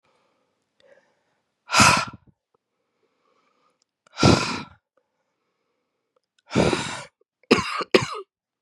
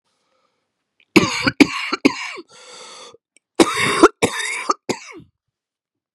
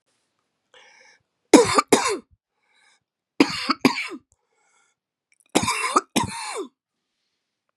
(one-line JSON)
{"exhalation_length": "8.6 s", "exhalation_amplitude": 29197, "exhalation_signal_mean_std_ratio": 0.3, "cough_length": "6.1 s", "cough_amplitude": 32768, "cough_signal_mean_std_ratio": 0.34, "three_cough_length": "7.8 s", "three_cough_amplitude": 32768, "three_cough_signal_mean_std_ratio": 0.3, "survey_phase": "beta (2021-08-13 to 2022-03-07)", "age": "45-64", "gender": "Female", "wearing_mask": "No", "symptom_cough_any": true, "symptom_runny_or_blocked_nose": true, "symptom_fatigue": true, "smoker_status": "Ex-smoker", "respiratory_condition_asthma": false, "respiratory_condition_other": false, "recruitment_source": "Test and Trace", "submission_delay": "2 days", "covid_test_result": "Positive", "covid_test_method": "RT-qPCR", "covid_ct_value": 21.1, "covid_ct_gene": "ORF1ab gene", "covid_ct_mean": 21.5, "covid_viral_load": "87000 copies/ml", "covid_viral_load_category": "Low viral load (10K-1M copies/ml)"}